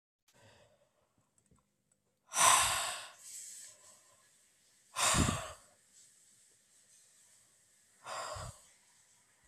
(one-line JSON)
{"exhalation_length": "9.5 s", "exhalation_amplitude": 8869, "exhalation_signal_mean_std_ratio": 0.31, "survey_phase": "beta (2021-08-13 to 2022-03-07)", "age": "65+", "gender": "Male", "wearing_mask": "No", "symptom_none": true, "smoker_status": "Never smoked", "respiratory_condition_asthma": false, "respiratory_condition_other": false, "recruitment_source": "REACT", "submission_delay": "0 days", "covid_test_result": "Negative", "covid_test_method": "RT-qPCR"}